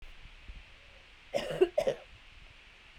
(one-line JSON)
{"three_cough_length": "3.0 s", "three_cough_amplitude": 9270, "three_cough_signal_mean_std_ratio": 0.36, "survey_phase": "beta (2021-08-13 to 2022-03-07)", "age": "45-64", "gender": "Female", "wearing_mask": "No", "symptom_none": true, "smoker_status": "Never smoked", "respiratory_condition_asthma": true, "respiratory_condition_other": false, "recruitment_source": "REACT", "submission_delay": "2 days", "covid_test_result": "Negative", "covid_test_method": "RT-qPCR", "influenza_a_test_result": "Negative", "influenza_b_test_result": "Negative"}